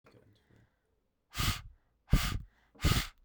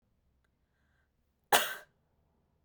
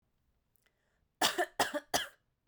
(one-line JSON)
{"exhalation_length": "3.2 s", "exhalation_amplitude": 7828, "exhalation_signal_mean_std_ratio": 0.36, "cough_length": "2.6 s", "cough_amplitude": 11852, "cough_signal_mean_std_ratio": 0.2, "three_cough_length": "2.5 s", "three_cough_amplitude": 6864, "three_cough_signal_mean_std_ratio": 0.34, "survey_phase": "beta (2021-08-13 to 2022-03-07)", "age": "18-44", "gender": "Female", "wearing_mask": "No", "symptom_cough_any": true, "symptom_new_continuous_cough": true, "symptom_shortness_of_breath": true, "symptom_sore_throat": true, "symptom_other": true, "smoker_status": "Never smoked", "respiratory_condition_asthma": false, "respiratory_condition_other": false, "recruitment_source": "Test and Trace", "submission_delay": "2 days", "covid_test_result": "Positive", "covid_test_method": "RT-qPCR", "covid_ct_value": 35.9, "covid_ct_gene": "ORF1ab gene"}